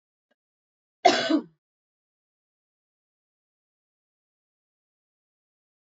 {
  "cough_length": "5.9 s",
  "cough_amplitude": 20807,
  "cough_signal_mean_std_ratio": 0.17,
  "survey_phase": "beta (2021-08-13 to 2022-03-07)",
  "age": "45-64",
  "gender": "Female",
  "wearing_mask": "No",
  "symptom_cough_any": true,
  "symptom_other": true,
  "smoker_status": "Never smoked",
  "respiratory_condition_asthma": false,
  "respiratory_condition_other": false,
  "recruitment_source": "Test and Trace",
  "submission_delay": "2 days",
  "covid_test_result": "Positive",
  "covid_test_method": "RT-qPCR",
  "covid_ct_value": 27.7,
  "covid_ct_gene": "ORF1ab gene",
  "covid_ct_mean": 28.2,
  "covid_viral_load": "560 copies/ml",
  "covid_viral_load_category": "Minimal viral load (< 10K copies/ml)"
}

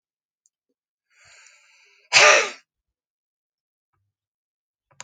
{
  "exhalation_length": "5.0 s",
  "exhalation_amplitude": 31025,
  "exhalation_signal_mean_std_ratio": 0.21,
  "survey_phase": "beta (2021-08-13 to 2022-03-07)",
  "age": "65+",
  "gender": "Male",
  "wearing_mask": "No",
  "symptom_cough_any": true,
  "symptom_shortness_of_breath": true,
  "smoker_status": "Ex-smoker",
  "respiratory_condition_asthma": false,
  "respiratory_condition_other": true,
  "recruitment_source": "REACT",
  "submission_delay": "0 days",
  "covid_test_result": "Negative",
  "covid_test_method": "RT-qPCR"
}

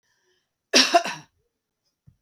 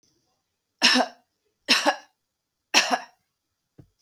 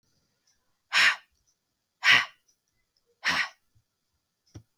{
  "cough_length": "2.2 s",
  "cough_amplitude": 29107,
  "cough_signal_mean_std_ratio": 0.28,
  "three_cough_length": "4.0 s",
  "three_cough_amplitude": 23292,
  "three_cough_signal_mean_std_ratio": 0.32,
  "exhalation_length": "4.8 s",
  "exhalation_amplitude": 15324,
  "exhalation_signal_mean_std_ratio": 0.28,
  "survey_phase": "beta (2021-08-13 to 2022-03-07)",
  "age": "45-64",
  "gender": "Female",
  "wearing_mask": "No",
  "symptom_none": true,
  "smoker_status": "Ex-smoker",
  "respiratory_condition_asthma": false,
  "respiratory_condition_other": false,
  "recruitment_source": "REACT",
  "submission_delay": "1 day",
  "covid_test_result": "Negative",
  "covid_test_method": "RT-qPCR",
  "influenza_a_test_result": "Negative",
  "influenza_b_test_result": "Negative"
}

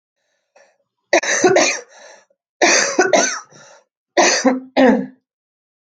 {
  "cough_length": "5.8 s",
  "cough_amplitude": 28340,
  "cough_signal_mean_std_ratio": 0.49,
  "survey_phase": "alpha (2021-03-01 to 2021-08-12)",
  "age": "18-44",
  "gender": "Female",
  "wearing_mask": "No",
  "symptom_cough_any": true,
  "symptom_diarrhoea": true,
  "symptom_fever_high_temperature": true,
  "symptom_loss_of_taste": true,
  "symptom_onset": "5 days",
  "smoker_status": "Never smoked",
  "respiratory_condition_asthma": false,
  "respiratory_condition_other": false,
  "recruitment_source": "Test and Trace",
  "submission_delay": "1 day",
  "covid_test_result": "Positive",
  "covid_test_method": "RT-qPCR",
  "covid_ct_value": 18.6,
  "covid_ct_gene": "ORF1ab gene"
}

